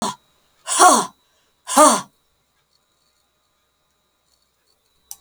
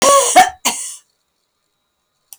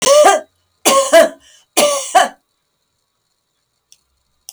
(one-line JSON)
{"exhalation_length": "5.2 s", "exhalation_amplitude": 32768, "exhalation_signal_mean_std_ratio": 0.28, "cough_length": "2.4 s", "cough_amplitude": 32768, "cough_signal_mean_std_ratio": 0.41, "three_cough_length": "4.5 s", "three_cough_amplitude": 32768, "three_cough_signal_mean_std_ratio": 0.43, "survey_phase": "beta (2021-08-13 to 2022-03-07)", "age": "65+", "gender": "Female", "wearing_mask": "No", "symptom_none": true, "smoker_status": "Never smoked", "respiratory_condition_asthma": false, "respiratory_condition_other": false, "recruitment_source": "REACT", "submission_delay": "1 day", "covid_test_result": "Negative", "covid_test_method": "RT-qPCR"}